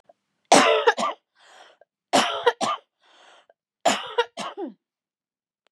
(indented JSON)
{
  "three_cough_length": "5.7 s",
  "three_cough_amplitude": 29180,
  "three_cough_signal_mean_std_ratio": 0.37,
  "survey_phase": "beta (2021-08-13 to 2022-03-07)",
  "age": "45-64",
  "gender": "Female",
  "wearing_mask": "No",
  "symptom_cough_any": true,
  "symptom_shortness_of_breath": true,
  "symptom_sore_throat": true,
  "symptom_fatigue": true,
  "symptom_change_to_sense_of_smell_or_taste": true,
  "symptom_onset": "4 days",
  "smoker_status": "Ex-smoker",
  "respiratory_condition_asthma": false,
  "respiratory_condition_other": false,
  "recruitment_source": "Test and Trace",
  "submission_delay": "2 days",
  "covid_test_result": "Positive",
  "covid_test_method": "RT-qPCR",
  "covid_ct_value": 27.4,
  "covid_ct_gene": "N gene"
}